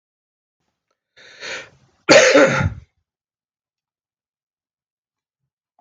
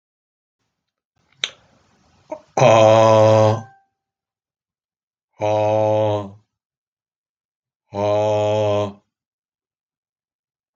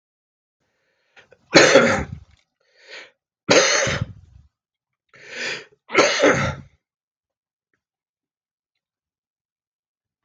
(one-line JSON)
{"cough_length": "5.8 s", "cough_amplitude": 32768, "cough_signal_mean_std_ratio": 0.26, "exhalation_length": "10.8 s", "exhalation_amplitude": 31204, "exhalation_signal_mean_std_ratio": 0.41, "three_cough_length": "10.2 s", "three_cough_amplitude": 32768, "three_cough_signal_mean_std_ratio": 0.32, "survey_phase": "beta (2021-08-13 to 2022-03-07)", "age": "65+", "gender": "Male", "wearing_mask": "No", "symptom_cough_any": true, "symptom_runny_or_blocked_nose": true, "symptom_fatigue": true, "symptom_change_to_sense_of_smell_or_taste": true, "symptom_loss_of_taste": true, "symptom_onset": "6 days", "smoker_status": "Never smoked", "respiratory_condition_asthma": false, "respiratory_condition_other": false, "recruitment_source": "Test and Trace", "submission_delay": "1 day", "covid_test_result": "Positive", "covid_test_method": "RT-qPCR"}